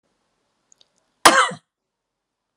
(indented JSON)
{
  "cough_length": "2.6 s",
  "cough_amplitude": 32768,
  "cough_signal_mean_std_ratio": 0.22,
  "survey_phase": "alpha (2021-03-01 to 2021-08-12)",
  "age": "45-64",
  "gender": "Female",
  "wearing_mask": "No",
  "symptom_none": true,
  "smoker_status": "Never smoked",
  "respiratory_condition_asthma": false,
  "respiratory_condition_other": false,
  "recruitment_source": "REACT",
  "submission_delay": "3 days",
  "covid_test_result": "Negative",
  "covid_test_method": "RT-qPCR"
}